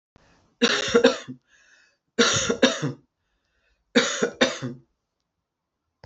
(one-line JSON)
{"three_cough_length": "6.1 s", "three_cough_amplitude": 24447, "three_cough_signal_mean_std_ratio": 0.39, "survey_phase": "beta (2021-08-13 to 2022-03-07)", "age": "65+", "gender": "Female", "wearing_mask": "No", "symptom_none": true, "symptom_onset": "12 days", "smoker_status": "Ex-smoker", "respiratory_condition_asthma": false, "respiratory_condition_other": false, "recruitment_source": "REACT", "submission_delay": "2 days", "covid_test_result": "Negative", "covid_test_method": "RT-qPCR", "influenza_a_test_result": "Negative", "influenza_b_test_result": "Negative"}